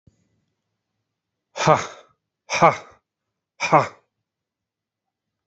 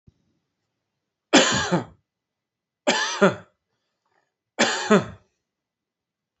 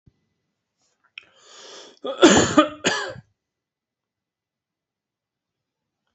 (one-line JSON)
{"exhalation_length": "5.5 s", "exhalation_amplitude": 30989, "exhalation_signal_mean_std_ratio": 0.24, "three_cough_length": "6.4 s", "three_cough_amplitude": 26606, "three_cough_signal_mean_std_ratio": 0.32, "cough_length": "6.1 s", "cough_amplitude": 29273, "cough_signal_mean_std_ratio": 0.25, "survey_phase": "beta (2021-08-13 to 2022-03-07)", "age": "45-64", "gender": "Male", "wearing_mask": "No", "symptom_other": true, "smoker_status": "Never smoked", "respiratory_condition_asthma": false, "respiratory_condition_other": false, "recruitment_source": "REACT", "submission_delay": "3 days", "covid_test_result": "Negative", "covid_test_method": "RT-qPCR"}